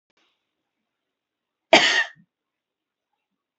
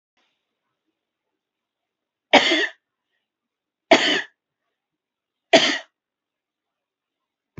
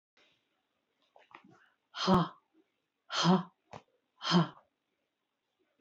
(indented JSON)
{
  "cough_length": "3.6 s",
  "cough_amplitude": 27776,
  "cough_signal_mean_std_ratio": 0.22,
  "three_cough_length": "7.6 s",
  "three_cough_amplitude": 32215,
  "three_cough_signal_mean_std_ratio": 0.24,
  "exhalation_length": "5.8 s",
  "exhalation_amplitude": 6432,
  "exhalation_signal_mean_std_ratio": 0.3,
  "survey_phase": "beta (2021-08-13 to 2022-03-07)",
  "age": "45-64",
  "gender": "Female",
  "wearing_mask": "No",
  "symptom_loss_of_taste": true,
  "smoker_status": "Never smoked",
  "respiratory_condition_asthma": false,
  "respiratory_condition_other": false,
  "recruitment_source": "REACT",
  "submission_delay": "1 day",
  "covid_test_result": "Negative",
  "covid_test_method": "RT-qPCR",
  "influenza_a_test_result": "Negative",
  "influenza_b_test_result": "Negative"
}